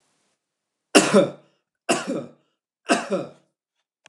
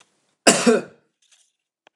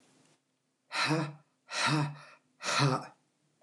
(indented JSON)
{
  "three_cough_length": "4.1 s",
  "three_cough_amplitude": 29203,
  "three_cough_signal_mean_std_ratio": 0.33,
  "cough_length": "2.0 s",
  "cough_amplitude": 29203,
  "cough_signal_mean_std_ratio": 0.31,
  "exhalation_length": "3.6 s",
  "exhalation_amplitude": 5267,
  "exhalation_signal_mean_std_ratio": 0.49,
  "survey_phase": "beta (2021-08-13 to 2022-03-07)",
  "age": "45-64",
  "gender": "Male",
  "wearing_mask": "No",
  "symptom_none": true,
  "smoker_status": "Never smoked",
  "respiratory_condition_asthma": false,
  "respiratory_condition_other": false,
  "recruitment_source": "REACT",
  "submission_delay": "6 days",
  "covid_test_result": "Negative",
  "covid_test_method": "RT-qPCR"
}